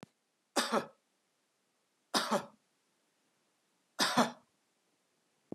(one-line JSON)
{"three_cough_length": "5.5 s", "three_cough_amplitude": 6867, "three_cough_signal_mean_std_ratio": 0.29, "survey_phase": "beta (2021-08-13 to 2022-03-07)", "age": "65+", "gender": "Male", "wearing_mask": "No", "symptom_fatigue": true, "smoker_status": "Never smoked", "respiratory_condition_asthma": false, "respiratory_condition_other": false, "recruitment_source": "REACT", "submission_delay": "1 day", "covid_test_result": "Negative", "covid_test_method": "RT-qPCR", "influenza_a_test_result": "Negative", "influenza_b_test_result": "Negative"}